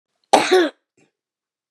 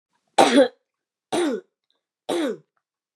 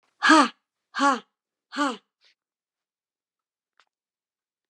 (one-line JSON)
{"cough_length": "1.7 s", "cough_amplitude": 32768, "cough_signal_mean_std_ratio": 0.35, "three_cough_length": "3.2 s", "three_cough_amplitude": 28484, "three_cough_signal_mean_std_ratio": 0.37, "exhalation_length": "4.7 s", "exhalation_amplitude": 24813, "exhalation_signal_mean_std_ratio": 0.26, "survey_phase": "beta (2021-08-13 to 2022-03-07)", "age": "65+", "gender": "Female", "wearing_mask": "No", "symptom_none": true, "smoker_status": "Never smoked", "respiratory_condition_asthma": false, "respiratory_condition_other": false, "recruitment_source": "REACT", "submission_delay": "2 days", "covid_test_result": "Negative", "covid_test_method": "RT-qPCR", "influenza_a_test_result": "Negative", "influenza_b_test_result": "Negative"}